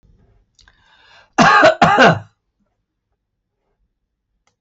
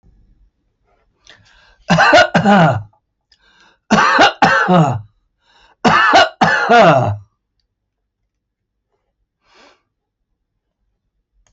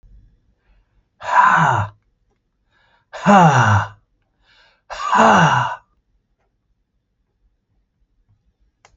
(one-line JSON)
{"cough_length": "4.6 s", "cough_amplitude": 28692, "cough_signal_mean_std_ratio": 0.34, "three_cough_length": "11.5 s", "three_cough_amplitude": 32768, "three_cough_signal_mean_std_ratio": 0.44, "exhalation_length": "9.0 s", "exhalation_amplitude": 28465, "exhalation_signal_mean_std_ratio": 0.38, "survey_phase": "beta (2021-08-13 to 2022-03-07)", "age": "65+", "gender": "Male", "wearing_mask": "No", "symptom_none": true, "smoker_status": "Ex-smoker", "respiratory_condition_asthma": false, "respiratory_condition_other": false, "recruitment_source": "REACT", "submission_delay": "1 day", "covid_test_result": "Negative", "covid_test_method": "RT-qPCR"}